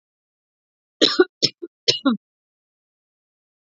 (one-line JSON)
{"three_cough_length": "3.7 s", "three_cough_amplitude": 30307, "three_cough_signal_mean_std_ratio": 0.25, "survey_phase": "beta (2021-08-13 to 2022-03-07)", "age": "18-44", "gender": "Female", "wearing_mask": "No", "symptom_runny_or_blocked_nose": true, "symptom_sore_throat": true, "symptom_fatigue": true, "symptom_change_to_sense_of_smell_or_taste": true, "symptom_other": true, "smoker_status": "Never smoked", "respiratory_condition_asthma": false, "respiratory_condition_other": false, "recruitment_source": "Test and Trace", "submission_delay": "2 days", "covid_test_result": "Positive", "covid_test_method": "RT-qPCR", "covid_ct_value": 22.2, "covid_ct_gene": "ORF1ab gene", "covid_ct_mean": 23.0, "covid_viral_load": "28000 copies/ml", "covid_viral_load_category": "Low viral load (10K-1M copies/ml)"}